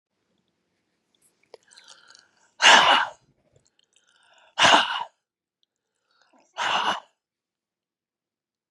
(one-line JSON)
{"exhalation_length": "8.7 s", "exhalation_amplitude": 26446, "exhalation_signal_mean_std_ratio": 0.27, "survey_phase": "beta (2021-08-13 to 2022-03-07)", "age": "65+", "gender": "Female", "wearing_mask": "No", "symptom_cough_any": true, "smoker_status": "Ex-smoker", "respiratory_condition_asthma": false, "respiratory_condition_other": true, "recruitment_source": "REACT", "submission_delay": "2 days", "covid_test_result": "Negative", "covid_test_method": "RT-qPCR", "influenza_a_test_result": "Negative", "influenza_b_test_result": "Negative"}